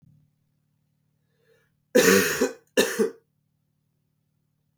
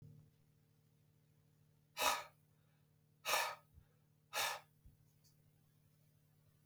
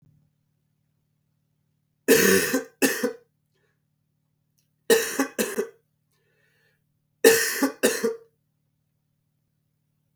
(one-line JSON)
{"cough_length": "4.8 s", "cough_amplitude": 24683, "cough_signal_mean_std_ratio": 0.31, "exhalation_length": "6.7 s", "exhalation_amplitude": 2834, "exhalation_signal_mean_std_ratio": 0.31, "three_cough_length": "10.2 s", "three_cough_amplitude": 28871, "three_cough_signal_mean_std_ratio": 0.33, "survey_phase": "beta (2021-08-13 to 2022-03-07)", "age": "18-44", "gender": "Male", "wearing_mask": "No", "symptom_cough_any": true, "symptom_runny_or_blocked_nose": true, "symptom_sore_throat": true, "symptom_onset": "5 days", "smoker_status": "Never smoked", "respiratory_condition_asthma": false, "respiratory_condition_other": false, "recruitment_source": "REACT", "submission_delay": "3 days", "covid_test_result": "Negative", "covid_test_method": "RT-qPCR", "influenza_a_test_result": "Negative", "influenza_b_test_result": "Negative"}